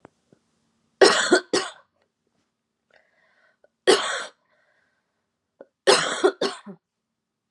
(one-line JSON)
{"three_cough_length": "7.5 s", "three_cough_amplitude": 27043, "three_cough_signal_mean_std_ratio": 0.3, "survey_phase": "beta (2021-08-13 to 2022-03-07)", "age": "18-44", "gender": "Female", "wearing_mask": "No", "symptom_cough_any": true, "symptom_runny_or_blocked_nose": true, "symptom_shortness_of_breath": true, "symptom_diarrhoea": true, "symptom_fatigue": true, "symptom_headache": true, "symptom_onset": "5 days", "smoker_status": "Current smoker (1 to 10 cigarettes per day)", "respiratory_condition_asthma": true, "respiratory_condition_other": false, "recruitment_source": "REACT", "submission_delay": "1 day", "covid_test_result": "Positive", "covid_test_method": "RT-qPCR", "covid_ct_value": 20.8, "covid_ct_gene": "E gene", "influenza_a_test_result": "Negative", "influenza_b_test_result": "Negative"}